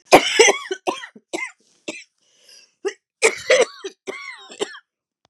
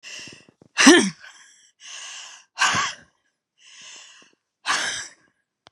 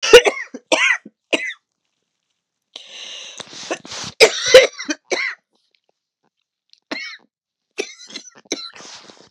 {"cough_length": "5.3 s", "cough_amplitude": 32768, "cough_signal_mean_std_ratio": 0.34, "exhalation_length": "5.7 s", "exhalation_amplitude": 32767, "exhalation_signal_mean_std_ratio": 0.32, "three_cough_length": "9.3 s", "three_cough_amplitude": 32768, "three_cough_signal_mean_std_ratio": 0.29, "survey_phase": "beta (2021-08-13 to 2022-03-07)", "age": "45-64", "gender": "Female", "wearing_mask": "No", "symptom_cough_any": true, "symptom_new_continuous_cough": true, "symptom_runny_or_blocked_nose": true, "symptom_shortness_of_breath": true, "symptom_sore_throat": true, "symptom_fatigue": true, "symptom_headache": true, "symptom_onset": "3 days", "smoker_status": "Ex-smoker", "respiratory_condition_asthma": true, "respiratory_condition_other": false, "recruitment_source": "Test and Trace", "submission_delay": "1 day", "covid_test_result": "Positive", "covid_test_method": "ePCR"}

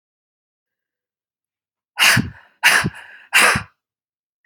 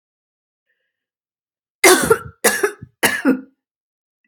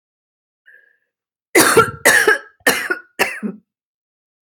{"exhalation_length": "4.5 s", "exhalation_amplitude": 32768, "exhalation_signal_mean_std_ratio": 0.34, "three_cough_length": "4.3 s", "three_cough_amplitude": 32768, "three_cough_signal_mean_std_ratio": 0.33, "cough_length": "4.5 s", "cough_amplitude": 32768, "cough_signal_mean_std_ratio": 0.39, "survey_phase": "alpha (2021-03-01 to 2021-08-12)", "age": "45-64", "gender": "Female", "wearing_mask": "No", "symptom_none": true, "smoker_status": "Never smoked", "respiratory_condition_asthma": true, "respiratory_condition_other": false, "recruitment_source": "REACT", "submission_delay": "2 days", "covid_test_result": "Negative", "covid_test_method": "RT-qPCR"}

